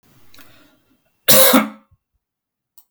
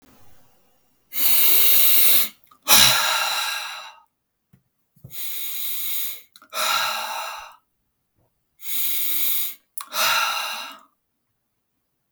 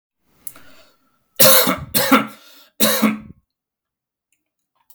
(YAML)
cough_length: 2.9 s
cough_amplitude: 32768
cough_signal_mean_std_ratio: 0.31
exhalation_length: 12.1 s
exhalation_amplitude: 32767
exhalation_signal_mean_std_ratio: 0.52
three_cough_length: 4.9 s
three_cough_amplitude: 32768
three_cough_signal_mean_std_ratio: 0.37
survey_phase: beta (2021-08-13 to 2022-03-07)
age: 18-44
gender: Male
wearing_mask: 'No'
symptom_none: true
smoker_status: Never smoked
respiratory_condition_asthma: false
respiratory_condition_other: false
recruitment_source: REACT
submission_delay: 5 days
covid_test_result: Negative
covid_test_method: RT-qPCR
influenza_a_test_result: Negative
influenza_b_test_result: Negative